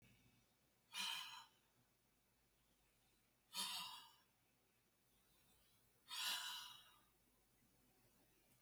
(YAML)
exhalation_length: 8.6 s
exhalation_amplitude: 799
exhalation_signal_mean_std_ratio: 0.4
survey_phase: beta (2021-08-13 to 2022-03-07)
age: 65+
gender: Male
wearing_mask: 'No'
symptom_none: true
smoker_status: Never smoked
respiratory_condition_asthma: false
respiratory_condition_other: false
recruitment_source: REACT
submission_delay: 3 days
covid_test_result: Negative
covid_test_method: RT-qPCR